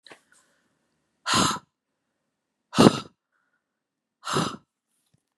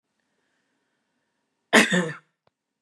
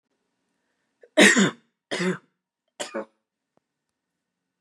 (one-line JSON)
{"exhalation_length": "5.4 s", "exhalation_amplitude": 31711, "exhalation_signal_mean_std_ratio": 0.25, "cough_length": "2.8 s", "cough_amplitude": 29516, "cough_signal_mean_std_ratio": 0.25, "three_cough_length": "4.6 s", "three_cough_amplitude": 27670, "three_cough_signal_mean_std_ratio": 0.27, "survey_phase": "beta (2021-08-13 to 2022-03-07)", "age": "18-44", "gender": "Female", "wearing_mask": "No", "symptom_none": true, "smoker_status": "Ex-smoker", "respiratory_condition_asthma": false, "respiratory_condition_other": false, "recruitment_source": "REACT", "submission_delay": "1 day", "covid_test_result": "Negative", "covid_test_method": "RT-qPCR", "influenza_a_test_result": "Negative", "influenza_b_test_result": "Negative"}